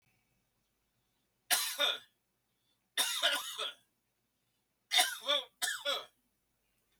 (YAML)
three_cough_length: 7.0 s
three_cough_amplitude: 6951
three_cough_signal_mean_std_ratio: 0.39
survey_phase: beta (2021-08-13 to 2022-03-07)
age: 65+
gender: Male
wearing_mask: 'No'
symptom_none: true
smoker_status: Never smoked
respiratory_condition_asthma: false
respiratory_condition_other: false
recruitment_source: REACT
submission_delay: 3 days
covid_test_result: Negative
covid_test_method: RT-qPCR